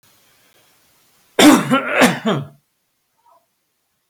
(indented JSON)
{
  "cough_length": "4.1 s",
  "cough_amplitude": 32768,
  "cough_signal_mean_std_ratio": 0.35,
  "survey_phase": "beta (2021-08-13 to 2022-03-07)",
  "age": "65+",
  "gender": "Male",
  "wearing_mask": "No",
  "symptom_none": true,
  "smoker_status": "Never smoked",
  "respiratory_condition_asthma": false,
  "respiratory_condition_other": false,
  "recruitment_source": "REACT",
  "submission_delay": "1 day",
  "covid_test_result": "Negative",
  "covid_test_method": "RT-qPCR",
  "influenza_a_test_result": "Negative",
  "influenza_b_test_result": "Negative"
}